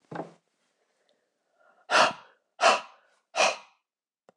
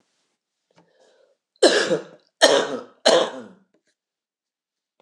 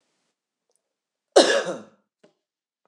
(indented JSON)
{
  "exhalation_length": "4.4 s",
  "exhalation_amplitude": 15320,
  "exhalation_signal_mean_std_ratio": 0.3,
  "three_cough_length": "5.0 s",
  "three_cough_amplitude": 26028,
  "three_cough_signal_mean_std_ratio": 0.33,
  "cough_length": "2.9 s",
  "cough_amplitude": 26027,
  "cough_signal_mean_std_ratio": 0.24,
  "survey_phase": "beta (2021-08-13 to 2022-03-07)",
  "age": "65+",
  "gender": "Female",
  "wearing_mask": "No",
  "symptom_sore_throat": true,
  "symptom_onset": "2 days",
  "smoker_status": "Never smoked",
  "respiratory_condition_asthma": false,
  "respiratory_condition_other": false,
  "recruitment_source": "Test and Trace",
  "submission_delay": "0 days",
  "covid_test_result": "Negative",
  "covid_test_method": "RT-qPCR"
}